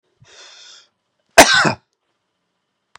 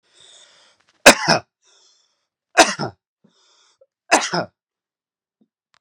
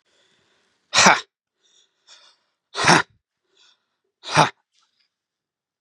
{
  "cough_length": "3.0 s",
  "cough_amplitude": 32768,
  "cough_signal_mean_std_ratio": 0.25,
  "three_cough_length": "5.8 s",
  "three_cough_amplitude": 32768,
  "three_cough_signal_mean_std_ratio": 0.23,
  "exhalation_length": "5.8 s",
  "exhalation_amplitude": 32767,
  "exhalation_signal_mean_std_ratio": 0.25,
  "survey_phase": "beta (2021-08-13 to 2022-03-07)",
  "age": "45-64",
  "gender": "Male",
  "wearing_mask": "No",
  "symptom_fatigue": true,
  "symptom_headache": true,
  "symptom_onset": "2 days",
  "smoker_status": "Ex-smoker",
  "respiratory_condition_asthma": false,
  "respiratory_condition_other": false,
  "recruitment_source": "Test and Trace",
  "submission_delay": "2 days",
  "covid_test_result": "Positive",
  "covid_test_method": "RT-qPCR",
  "covid_ct_value": 26.8,
  "covid_ct_gene": "N gene"
}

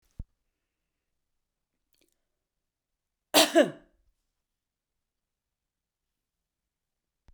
{
  "cough_length": "7.3 s",
  "cough_amplitude": 15754,
  "cough_signal_mean_std_ratio": 0.15,
  "survey_phase": "beta (2021-08-13 to 2022-03-07)",
  "age": "65+",
  "gender": "Female",
  "wearing_mask": "No",
  "symptom_other": true,
  "smoker_status": "Ex-smoker",
  "respiratory_condition_asthma": false,
  "respiratory_condition_other": false,
  "recruitment_source": "REACT",
  "submission_delay": "0 days",
  "covid_test_result": "Negative",
  "covid_test_method": "RT-qPCR"
}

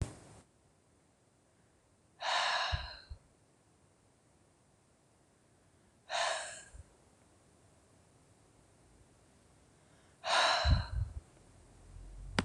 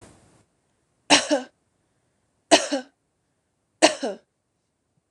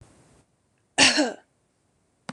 {
  "exhalation_length": "12.4 s",
  "exhalation_amplitude": 9633,
  "exhalation_signal_mean_std_ratio": 0.36,
  "three_cough_length": "5.1 s",
  "three_cough_amplitude": 26027,
  "three_cough_signal_mean_std_ratio": 0.25,
  "cough_length": "2.3 s",
  "cough_amplitude": 24504,
  "cough_signal_mean_std_ratio": 0.29,
  "survey_phase": "beta (2021-08-13 to 2022-03-07)",
  "age": "45-64",
  "gender": "Female",
  "wearing_mask": "No",
  "symptom_none": true,
  "smoker_status": "Never smoked",
  "respiratory_condition_asthma": false,
  "respiratory_condition_other": false,
  "recruitment_source": "REACT",
  "submission_delay": "2 days",
  "covid_test_result": "Negative",
  "covid_test_method": "RT-qPCR",
  "influenza_a_test_result": "Negative",
  "influenza_b_test_result": "Negative"
}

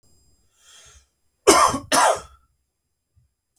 {
  "cough_length": "3.6 s",
  "cough_amplitude": 32766,
  "cough_signal_mean_std_ratio": 0.32,
  "survey_phase": "beta (2021-08-13 to 2022-03-07)",
  "age": "18-44",
  "gender": "Male",
  "wearing_mask": "No",
  "symptom_none": true,
  "smoker_status": "Ex-smoker",
  "respiratory_condition_asthma": true,
  "respiratory_condition_other": false,
  "recruitment_source": "Test and Trace",
  "submission_delay": "1 day",
  "covid_test_result": "Positive",
  "covid_test_method": "RT-qPCR",
  "covid_ct_value": 27.6,
  "covid_ct_gene": "ORF1ab gene"
}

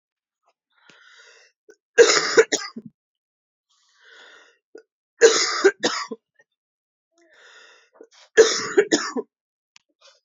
{
  "three_cough_length": "10.2 s",
  "three_cough_amplitude": 31580,
  "three_cough_signal_mean_std_ratio": 0.29,
  "survey_phase": "alpha (2021-03-01 to 2021-08-12)",
  "age": "18-44",
  "gender": "Female",
  "wearing_mask": "No",
  "symptom_cough_any": true,
  "symptom_new_continuous_cough": true,
  "symptom_shortness_of_breath": true,
  "symptom_fever_high_temperature": true,
  "symptom_headache": true,
  "symptom_change_to_sense_of_smell_or_taste": true,
  "smoker_status": "Ex-smoker",
  "respiratory_condition_asthma": false,
  "respiratory_condition_other": false,
  "recruitment_source": "Test and Trace",
  "submission_delay": "1 day",
  "covid_test_result": "Positive",
  "covid_test_method": "RT-qPCR",
  "covid_ct_value": 14.2,
  "covid_ct_gene": "ORF1ab gene",
  "covid_ct_mean": 15.3,
  "covid_viral_load": "9500000 copies/ml",
  "covid_viral_load_category": "High viral load (>1M copies/ml)"
}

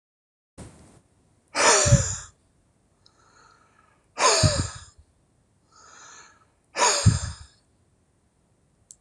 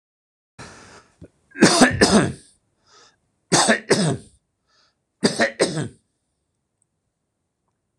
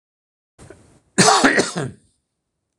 {
  "exhalation_length": "9.0 s",
  "exhalation_amplitude": 18782,
  "exhalation_signal_mean_std_ratio": 0.33,
  "three_cough_length": "8.0 s",
  "three_cough_amplitude": 26028,
  "three_cough_signal_mean_std_ratio": 0.35,
  "cough_length": "2.8 s",
  "cough_amplitude": 26028,
  "cough_signal_mean_std_ratio": 0.36,
  "survey_phase": "beta (2021-08-13 to 2022-03-07)",
  "age": "65+",
  "gender": "Male",
  "wearing_mask": "No",
  "symptom_none": true,
  "smoker_status": "Never smoked",
  "respiratory_condition_asthma": false,
  "respiratory_condition_other": false,
  "recruitment_source": "Test and Trace",
  "submission_delay": "2 days",
  "covid_test_result": "Positive",
  "covid_test_method": "RT-qPCR",
  "covid_ct_value": 25.9,
  "covid_ct_gene": "ORF1ab gene",
  "covid_ct_mean": 26.2,
  "covid_viral_load": "2500 copies/ml",
  "covid_viral_load_category": "Minimal viral load (< 10K copies/ml)"
}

